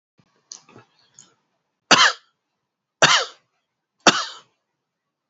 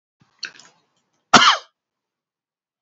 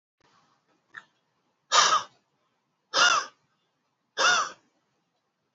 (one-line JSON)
{"three_cough_length": "5.3 s", "three_cough_amplitude": 31778, "three_cough_signal_mean_std_ratio": 0.25, "cough_length": "2.8 s", "cough_amplitude": 30787, "cough_signal_mean_std_ratio": 0.23, "exhalation_length": "5.5 s", "exhalation_amplitude": 15973, "exhalation_signal_mean_std_ratio": 0.32, "survey_phase": "beta (2021-08-13 to 2022-03-07)", "age": "45-64", "gender": "Male", "wearing_mask": "Yes", "symptom_none": true, "smoker_status": "Ex-smoker", "respiratory_condition_asthma": false, "respiratory_condition_other": false, "recruitment_source": "REACT", "submission_delay": "7 days", "covid_test_result": "Negative", "covid_test_method": "RT-qPCR", "influenza_a_test_result": "Negative", "influenza_b_test_result": "Negative"}